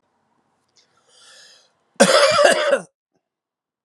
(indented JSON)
{
  "cough_length": "3.8 s",
  "cough_amplitude": 32635,
  "cough_signal_mean_std_ratio": 0.37,
  "survey_phase": "alpha (2021-03-01 to 2021-08-12)",
  "age": "45-64",
  "gender": "Male",
  "wearing_mask": "No",
  "symptom_cough_any": true,
  "symptom_fatigue": true,
  "symptom_headache": true,
  "smoker_status": "Never smoked",
  "respiratory_condition_asthma": false,
  "respiratory_condition_other": false,
  "recruitment_source": "Test and Trace",
  "submission_delay": "2 days",
  "covid_test_result": "Positive",
  "covid_test_method": "LFT"
}